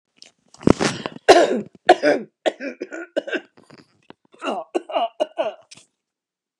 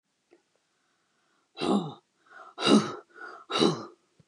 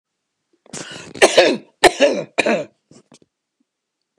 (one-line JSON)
{"three_cough_length": "6.6 s", "three_cough_amplitude": 29204, "three_cough_signal_mean_std_ratio": 0.34, "exhalation_length": "4.3 s", "exhalation_amplitude": 12446, "exhalation_signal_mean_std_ratio": 0.35, "cough_length": "4.2 s", "cough_amplitude": 29204, "cough_signal_mean_std_ratio": 0.35, "survey_phase": "beta (2021-08-13 to 2022-03-07)", "age": "45-64", "gender": "Female", "wearing_mask": "No", "symptom_none": true, "smoker_status": "Ex-smoker", "respiratory_condition_asthma": false, "respiratory_condition_other": false, "recruitment_source": "REACT", "submission_delay": "1 day", "covid_test_result": "Negative", "covid_test_method": "RT-qPCR", "influenza_a_test_result": "Negative", "influenza_b_test_result": "Negative"}